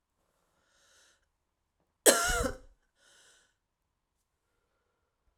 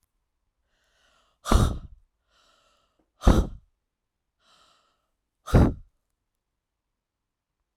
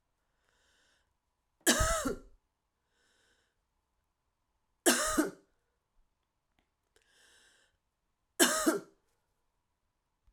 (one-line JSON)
{"cough_length": "5.4 s", "cough_amplitude": 16699, "cough_signal_mean_std_ratio": 0.21, "exhalation_length": "7.8 s", "exhalation_amplitude": 21474, "exhalation_signal_mean_std_ratio": 0.23, "three_cough_length": "10.3 s", "three_cough_amplitude": 11251, "three_cough_signal_mean_std_ratio": 0.27, "survey_phase": "beta (2021-08-13 to 2022-03-07)", "age": "45-64", "gender": "Female", "wearing_mask": "No", "symptom_cough_any": true, "symptom_new_continuous_cough": true, "symptom_runny_or_blocked_nose": true, "symptom_shortness_of_breath": true, "symptom_sore_throat": true, "symptom_fatigue": true, "symptom_fever_high_temperature": true, "symptom_headache": true, "symptom_change_to_sense_of_smell_or_taste": true, "symptom_onset": "3 days", "smoker_status": "Ex-smoker", "respiratory_condition_asthma": false, "respiratory_condition_other": false, "recruitment_source": "Test and Trace", "submission_delay": "2 days", "covid_test_method": "RT-qPCR", "covid_ct_value": 26.5, "covid_ct_gene": "N gene"}